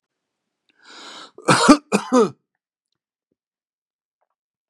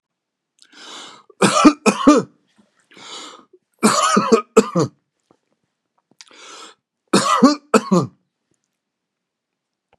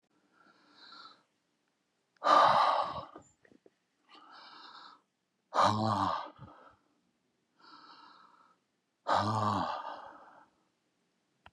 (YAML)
cough_length: 4.7 s
cough_amplitude: 32767
cough_signal_mean_std_ratio: 0.26
three_cough_length: 10.0 s
three_cough_amplitude: 32768
three_cough_signal_mean_std_ratio: 0.35
exhalation_length: 11.5 s
exhalation_amplitude: 9463
exhalation_signal_mean_std_ratio: 0.36
survey_phase: beta (2021-08-13 to 2022-03-07)
age: 65+
gender: Male
wearing_mask: 'No'
symptom_runny_or_blocked_nose: true
smoker_status: Ex-smoker
respiratory_condition_asthma: false
respiratory_condition_other: false
recruitment_source: REACT
submission_delay: 2 days
covid_test_result: Negative
covid_test_method: RT-qPCR